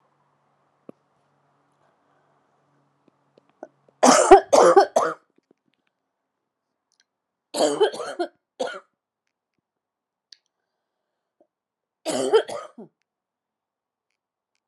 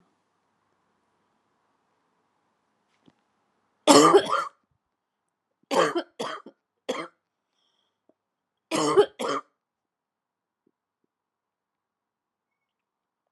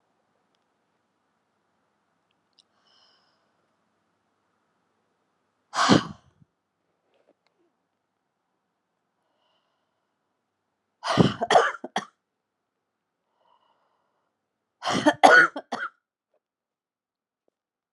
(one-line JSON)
{"three_cough_length": "14.7 s", "three_cough_amplitude": 32768, "three_cough_signal_mean_std_ratio": 0.24, "cough_length": "13.3 s", "cough_amplitude": 31034, "cough_signal_mean_std_ratio": 0.23, "exhalation_length": "17.9 s", "exhalation_amplitude": 31468, "exhalation_signal_mean_std_ratio": 0.2, "survey_phase": "beta (2021-08-13 to 2022-03-07)", "age": "45-64", "gender": "Female", "wearing_mask": "No", "symptom_cough_any": true, "symptom_fatigue": true, "symptom_change_to_sense_of_smell_or_taste": true, "symptom_loss_of_taste": true, "symptom_onset": "8 days", "smoker_status": "Never smoked", "respiratory_condition_asthma": false, "respiratory_condition_other": false, "recruitment_source": "Test and Trace", "submission_delay": "5 days", "covid_test_result": "Positive", "covid_test_method": "RT-qPCR", "covid_ct_value": 15.9, "covid_ct_gene": "ORF1ab gene", "covid_ct_mean": 16.0, "covid_viral_load": "5600000 copies/ml", "covid_viral_load_category": "High viral load (>1M copies/ml)"}